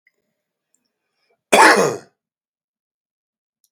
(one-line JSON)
{"cough_length": "3.7 s", "cough_amplitude": 32768, "cough_signal_mean_std_ratio": 0.26, "survey_phase": "beta (2021-08-13 to 2022-03-07)", "age": "45-64", "gender": "Male", "wearing_mask": "No", "symptom_cough_any": true, "smoker_status": "Ex-smoker", "respiratory_condition_asthma": false, "respiratory_condition_other": false, "recruitment_source": "REACT", "submission_delay": "0 days", "covid_test_result": "Negative", "covid_test_method": "RT-qPCR"}